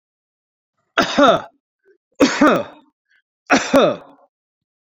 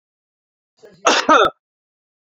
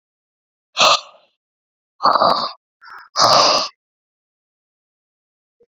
{"three_cough_length": "4.9 s", "three_cough_amplitude": 31878, "three_cough_signal_mean_std_ratio": 0.38, "cough_length": "2.3 s", "cough_amplitude": 28489, "cough_signal_mean_std_ratio": 0.33, "exhalation_length": "5.7 s", "exhalation_amplitude": 32388, "exhalation_signal_mean_std_ratio": 0.36, "survey_phase": "beta (2021-08-13 to 2022-03-07)", "age": "45-64", "gender": "Male", "wearing_mask": "No", "symptom_none": true, "smoker_status": "Ex-smoker", "respiratory_condition_asthma": false, "respiratory_condition_other": false, "recruitment_source": "REACT", "submission_delay": "2 days", "covid_test_result": "Negative", "covid_test_method": "RT-qPCR"}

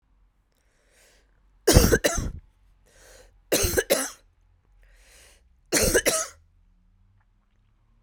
{"three_cough_length": "8.0 s", "three_cough_amplitude": 32768, "three_cough_signal_mean_std_ratio": 0.33, "survey_phase": "beta (2021-08-13 to 2022-03-07)", "age": "65+", "gender": "Female", "wearing_mask": "No", "symptom_cough_any": true, "symptom_runny_or_blocked_nose": true, "symptom_change_to_sense_of_smell_or_taste": true, "symptom_onset": "4 days", "smoker_status": "Never smoked", "respiratory_condition_asthma": false, "respiratory_condition_other": false, "recruitment_source": "Test and Trace", "submission_delay": "2 days", "covid_test_result": "Positive", "covid_test_method": "LAMP"}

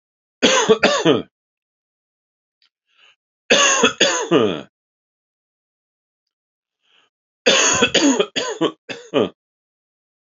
{"three_cough_length": "10.3 s", "three_cough_amplitude": 32768, "three_cough_signal_mean_std_ratio": 0.41, "survey_phase": "alpha (2021-03-01 to 2021-08-12)", "age": "45-64", "gender": "Male", "wearing_mask": "Yes", "symptom_cough_any": true, "symptom_headache": true, "smoker_status": "Never smoked", "respiratory_condition_asthma": false, "respiratory_condition_other": false, "recruitment_source": "Test and Trace", "submission_delay": "2 days", "covid_test_result": "Positive", "covid_test_method": "RT-qPCR", "covid_ct_value": 25.5, "covid_ct_gene": "ORF1ab gene", "covid_ct_mean": 25.8, "covid_viral_load": "3400 copies/ml", "covid_viral_load_category": "Minimal viral load (< 10K copies/ml)"}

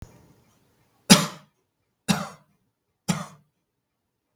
{"three_cough_length": "4.4 s", "three_cough_amplitude": 32768, "three_cough_signal_mean_std_ratio": 0.2, "survey_phase": "beta (2021-08-13 to 2022-03-07)", "age": "65+", "gender": "Male", "wearing_mask": "No", "symptom_cough_any": true, "smoker_status": "Never smoked", "respiratory_condition_asthma": false, "respiratory_condition_other": false, "recruitment_source": "REACT", "submission_delay": "2 days", "covid_test_result": "Negative", "covid_test_method": "RT-qPCR", "influenza_a_test_result": "Negative", "influenza_b_test_result": "Negative"}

